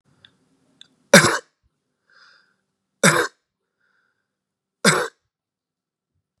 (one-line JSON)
{"three_cough_length": "6.4 s", "three_cough_amplitude": 32768, "three_cough_signal_mean_std_ratio": 0.23, "survey_phase": "beta (2021-08-13 to 2022-03-07)", "age": "18-44", "gender": "Male", "wearing_mask": "No", "symptom_none": true, "smoker_status": "Current smoker (11 or more cigarettes per day)", "respiratory_condition_asthma": false, "respiratory_condition_other": false, "recruitment_source": "REACT", "submission_delay": "4 days", "covid_test_result": "Negative", "covid_test_method": "RT-qPCR", "influenza_a_test_result": "Negative", "influenza_b_test_result": "Negative"}